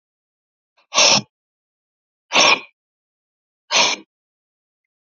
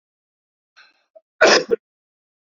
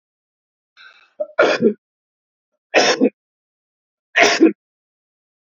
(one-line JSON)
{"exhalation_length": "5.0 s", "exhalation_amplitude": 32768, "exhalation_signal_mean_std_ratio": 0.31, "cough_length": "2.5 s", "cough_amplitude": 28957, "cough_signal_mean_std_ratio": 0.26, "three_cough_length": "5.5 s", "three_cough_amplitude": 29505, "three_cough_signal_mean_std_ratio": 0.34, "survey_phase": "beta (2021-08-13 to 2022-03-07)", "age": "65+", "gender": "Male", "wearing_mask": "No", "symptom_cough_any": true, "symptom_runny_or_blocked_nose": true, "symptom_change_to_sense_of_smell_or_taste": true, "smoker_status": "Ex-smoker", "respiratory_condition_asthma": false, "respiratory_condition_other": false, "recruitment_source": "Test and Trace", "submission_delay": "1 day", "covid_test_result": "Positive", "covid_test_method": "RT-qPCR", "covid_ct_value": 17.2, "covid_ct_gene": "ORF1ab gene", "covid_ct_mean": 17.7, "covid_viral_load": "1600000 copies/ml", "covid_viral_load_category": "High viral load (>1M copies/ml)"}